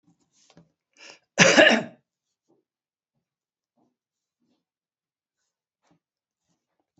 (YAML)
cough_length: 7.0 s
cough_amplitude: 27334
cough_signal_mean_std_ratio: 0.19
survey_phase: beta (2021-08-13 to 2022-03-07)
age: 65+
gender: Male
wearing_mask: 'No'
symptom_none: true
smoker_status: Never smoked
respiratory_condition_asthma: false
respiratory_condition_other: false
recruitment_source: REACT
submission_delay: 2 days
covid_test_result: Negative
covid_test_method: RT-qPCR